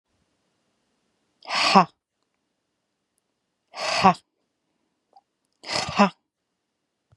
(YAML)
exhalation_length: 7.2 s
exhalation_amplitude: 31284
exhalation_signal_mean_std_ratio: 0.25
survey_phase: beta (2021-08-13 to 2022-03-07)
age: 45-64
gender: Female
wearing_mask: 'No'
symptom_fatigue: true
symptom_onset: 12 days
smoker_status: Never smoked
respiratory_condition_asthma: false
respiratory_condition_other: false
recruitment_source: REACT
submission_delay: 1 day
covid_test_result: Negative
covid_test_method: RT-qPCR
influenza_a_test_result: Negative
influenza_b_test_result: Negative